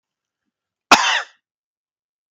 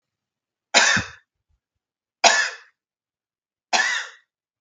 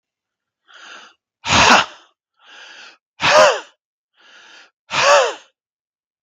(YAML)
cough_length: 2.3 s
cough_amplitude: 32768
cough_signal_mean_std_ratio: 0.25
three_cough_length: 4.6 s
three_cough_amplitude: 32575
three_cough_signal_mean_std_ratio: 0.33
exhalation_length: 6.2 s
exhalation_amplitude: 32768
exhalation_signal_mean_std_ratio: 0.35
survey_phase: beta (2021-08-13 to 2022-03-07)
age: 45-64
gender: Male
wearing_mask: 'No'
symptom_none: true
smoker_status: Never smoked
respiratory_condition_asthma: false
respiratory_condition_other: false
recruitment_source: REACT
submission_delay: 1 day
covid_test_result: Negative
covid_test_method: RT-qPCR
influenza_a_test_result: Negative
influenza_b_test_result: Negative